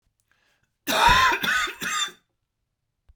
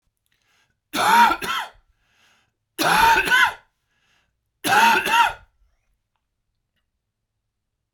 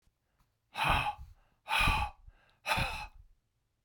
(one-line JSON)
{"cough_length": "3.2 s", "cough_amplitude": 18332, "cough_signal_mean_std_ratio": 0.47, "three_cough_length": "7.9 s", "three_cough_amplitude": 21930, "three_cough_signal_mean_std_ratio": 0.41, "exhalation_length": "3.8 s", "exhalation_amplitude": 5155, "exhalation_signal_mean_std_ratio": 0.47, "survey_phase": "beta (2021-08-13 to 2022-03-07)", "age": "65+", "gender": "Male", "wearing_mask": "No", "symptom_cough_any": true, "symptom_runny_or_blocked_nose": true, "symptom_sore_throat": true, "symptom_change_to_sense_of_smell_or_taste": true, "smoker_status": "Never smoked", "respiratory_condition_asthma": false, "respiratory_condition_other": false, "recruitment_source": "Test and Trace", "submission_delay": "2 days", "covid_test_result": "Positive", "covid_test_method": "ePCR"}